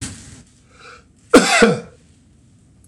{"cough_length": "2.9 s", "cough_amplitude": 26028, "cough_signal_mean_std_ratio": 0.33, "survey_phase": "beta (2021-08-13 to 2022-03-07)", "age": "65+", "gender": "Male", "wearing_mask": "No", "symptom_none": true, "smoker_status": "Never smoked", "respiratory_condition_asthma": true, "respiratory_condition_other": false, "recruitment_source": "REACT", "submission_delay": "1 day", "covid_test_result": "Negative", "covid_test_method": "RT-qPCR", "influenza_a_test_result": "Negative", "influenza_b_test_result": "Negative"}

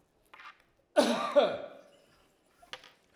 {"cough_length": "3.2 s", "cough_amplitude": 9706, "cough_signal_mean_std_ratio": 0.34, "survey_phase": "alpha (2021-03-01 to 2021-08-12)", "age": "65+", "gender": "Male", "wearing_mask": "No", "symptom_none": true, "smoker_status": "Never smoked", "respiratory_condition_asthma": false, "respiratory_condition_other": false, "recruitment_source": "REACT", "submission_delay": "2 days", "covid_test_result": "Negative", "covid_test_method": "RT-qPCR"}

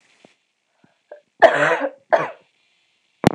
{"cough_length": "3.3 s", "cough_amplitude": 26028, "cough_signal_mean_std_ratio": 0.31, "survey_phase": "beta (2021-08-13 to 2022-03-07)", "age": "18-44", "gender": "Female", "wearing_mask": "No", "symptom_cough_any": true, "symptom_runny_or_blocked_nose": true, "symptom_sore_throat": true, "smoker_status": "Never smoked", "respiratory_condition_asthma": false, "respiratory_condition_other": false, "recruitment_source": "Test and Trace", "submission_delay": "1 day", "covid_test_result": "Positive", "covid_test_method": "RT-qPCR"}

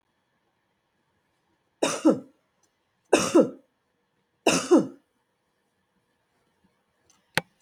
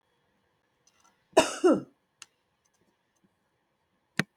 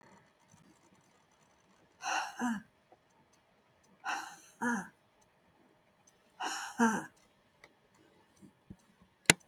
{"three_cough_length": "7.6 s", "three_cough_amplitude": 24858, "three_cough_signal_mean_std_ratio": 0.26, "cough_length": "4.4 s", "cough_amplitude": 16494, "cough_signal_mean_std_ratio": 0.21, "exhalation_length": "9.5 s", "exhalation_amplitude": 28472, "exhalation_signal_mean_std_ratio": 0.28, "survey_phase": "beta (2021-08-13 to 2022-03-07)", "age": "65+", "gender": "Female", "wearing_mask": "No", "symptom_none": true, "smoker_status": "Never smoked", "respiratory_condition_asthma": true, "respiratory_condition_other": false, "recruitment_source": "REACT", "submission_delay": "2 days", "covid_test_method": "RT-qPCR"}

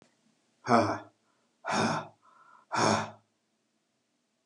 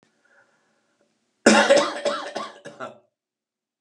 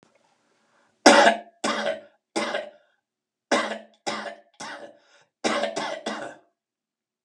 {"exhalation_length": "4.5 s", "exhalation_amplitude": 12922, "exhalation_signal_mean_std_ratio": 0.37, "cough_length": "3.8 s", "cough_amplitude": 31448, "cough_signal_mean_std_ratio": 0.34, "three_cough_length": "7.2 s", "three_cough_amplitude": 32767, "three_cough_signal_mean_std_ratio": 0.35, "survey_phase": "alpha (2021-03-01 to 2021-08-12)", "age": "65+", "gender": "Male", "wearing_mask": "No", "symptom_none": true, "smoker_status": "Never smoked", "respiratory_condition_asthma": false, "respiratory_condition_other": false, "recruitment_source": "REACT", "submission_delay": "3 days", "covid_test_result": "Negative", "covid_test_method": "RT-qPCR"}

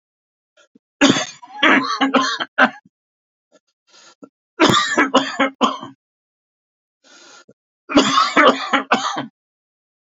{"three_cough_length": "10.1 s", "three_cough_amplitude": 31873, "three_cough_signal_mean_std_ratio": 0.43, "survey_phase": "beta (2021-08-13 to 2022-03-07)", "age": "65+", "gender": "Male", "wearing_mask": "No", "symptom_cough_any": true, "symptom_runny_or_blocked_nose": true, "smoker_status": "Never smoked", "respiratory_condition_asthma": false, "respiratory_condition_other": false, "recruitment_source": "REACT", "submission_delay": "1 day", "covid_test_result": "Negative", "covid_test_method": "RT-qPCR", "influenza_a_test_result": "Negative", "influenza_b_test_result": "Negative"}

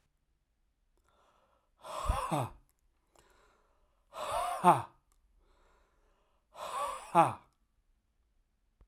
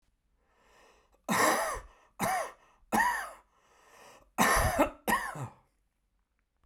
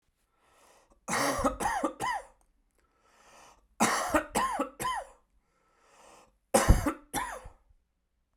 {"exhalation_length": "8.9 s", "exhalation_amplitude": 10723, "exhalation_signal_mean_std_ratio": 0.29, "cough_length": "6.7 s", "cough_amplitude": 10179, "cough_signal_mean_std_ratio": 0.45, "three_cough_length": "8.4 s", "three_cough_amplitude": 16211, "three_cough_signal_mean_std_ratio": 0.41, "survey_phase": "beta (2021-08-13 to 2022-03-07)", "age": "45-64", "gender": "Male", "wearing_mask": "No", "symptom_runny_or_blocked_nose": true, "symptom_shortness_of_breath": true, "symptom_sore_throat": true, "symptom_fatigue": true, "symptom_headache": true, "symptom_other": true, "symptom_onset": "3 days", "smoker_status": "Ex-smoker", "respiratory_condition_asthma": false, "respiratory_condition_other": false, "recruitment_source": "Test and Trace", "submission_delay": "1 day", "covid_test_result": "Positive", "covid_test_method": "RT-qPCR", "covid_ct_value": 15.0, "covid_ct_gene": "ORF1ab gene", "covid_ct_mean": 15.7, "covid_viral_load": "7300000 copies/ml", "covid_viral_load_category": "High viral load (>1M copies/ml)"}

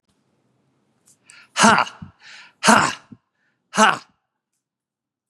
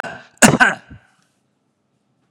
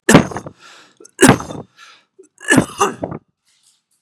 {"exhalation_length": "5.3 s", "exhalation_amplitude": 32767, "exhalation_signal_mean_std_ratio": 0.28, "cough_length": "2.3 s", "cough_amplitude": 32768, "cough_signal_mean_std_ratio": 0.28, "three_cough_length": "4.0 s", "three_cough_amplitude": 32768, "three_cough_signal_mean_std_ratio": 0.33, "survey_phase": "beta (2021-08-13 to 2022-03-07)", "age": "65+", "gender": "Male", "wearing_mask": "No", "symptom_none": true, "smoker_status": "Ex-smoker", "respiratory_condition_asthma": false, "respiratory_condition_other": false, "recruitment_source": "REACT", "submission_delay": "2 days", "covid_test_result": "Negative", "covid_test_method": "RT-qPCR", "influenza_a_test_result": "Negative", "influenza_b_test_result": "Negative"}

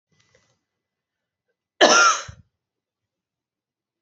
{"cough_length": "4.0 s", "cough_amplitude": 26945, "cough_signal_mean_std_ratio": 0.25, "survey_phase": "alpha (2021-03-01 to 2021-08-12)", "age": "18-44", "gender": "Female", "wearing_mask": "No", "symptom_fatigue": true, "symptom_headache": true, "symptom_change_to_sense_of_smell_or_taste": true, "symptom_loss_of_taste": true, "symptom_onset": "3 days", "smoker_status": "Never smoked", "respiratory_condition_asthma": false, "respiratory_condition_other": false, "recruitment_source": "Test and Trace", "submission_delay": "2 days", "covid_test_result": "Positive", "covid_test_method": "RT-qPCR", "covid_ct_value": 18.9, "covid_ct_gene": "ORF1ab gene", "covid_ct_mean": 19.0, "covid_viral_load": "570000 copies/ml", "covid_viral_load_category": "Low viral load (10K-1M copies/ml)"}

